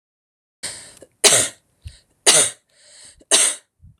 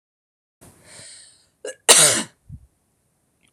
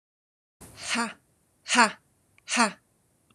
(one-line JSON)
{"three_cough_length": "4.0 s", "three_cough_amplitude": 29754, "three_cough_signal_mean_std_ratio": 0.35, "cough_length": "3.5 s", "cough_amplitude": 30427, "cough_signal_mean_std_ratio": 0.26, "exhalation_length": "3.3 s", "exhalation_amplitude": 24625, "exhalation_signal_mean_std_ratio": 0.31, "survey_phase": "alpha (2021-03-01 to 2021-08-12)", "age": "45-64", "gender": "Female", "wearing_mask": "No", "symptom_none": true, "smoker_status": "Never smoked", "respiratory_condition_asthma": false, "respiratory_condition_other": false, "recruitment_source": "REACT", "submission_delay": "1 day", "covid_test_result": "Negative", "covid_test_method": "RT-qPCR"}